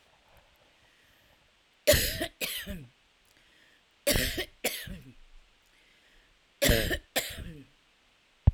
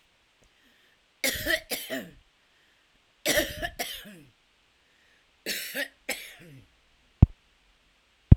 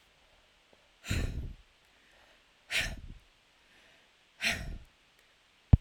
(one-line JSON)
{"three_cough_length": "8.5 s", "three_cough_amplitude": 14881, "three_cough_signal_mean_std_ratio": 0.34, "cough_length": "8.4 s", "cough_amplitude": 32768, "cough_signal_mean_std_ratio": 0.22, "exhalation_length": "5.8 s", "exhalation_amplitude": 18218, "exhalation_signal_mean_std_ratio": 0.25, "survey_phase": "alpha (2021-03-01 to 2021-08-12)", "age": "45-64", "gender": "Female", "wearing_mask": "No", "symptom_cough_any": true, "symptom_fatigue": true, "symptom_headache": true, "symptom_change_to_sense_of_smell_or_taste": true, "smoker_status": "Ex-smoker", "respiratory_condition_asthma": true, "respiratory_condition_other": false, "recruitment_source": "REACT", "submission_delay": "2 days", "covid_test_result": "Negative", "covid_test_method": "RT-qPCR", "covid_ct_value": 47.0, "covid_ct_gene": "N gene"}